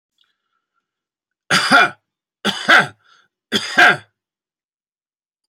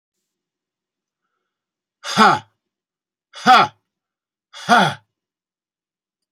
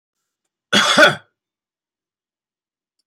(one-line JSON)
{"three_cough_length": "5.5 s", "three_cough_amplitude": 29477, "three_cough_signal_mean_std_ratio": 0.33, "exhalation_length": "6.3 s", "exhalation_amplitude": 31607, "exhalation_signal_mean_std_ratio": 0.27, "cough_length": "3.1 s", "cough_amplitude": 29924, "cough_signal_mean_std_ratio": 0.28, "survey_phase": "beta (2021-08-13 to 2022-03-07)", "age": "45-64", "gender": "Male", "wearing_mask": "No", "symptom_none": true, "smoker_status": "Ex-smoker", "respiratory_condition_asthma": false, "respiratory_condition_other": false, "recruitment_source": "REACT", "submission_delay": "1 day", "covid_test_result": "Negative", "covid_test_method": "RT-qPCR"}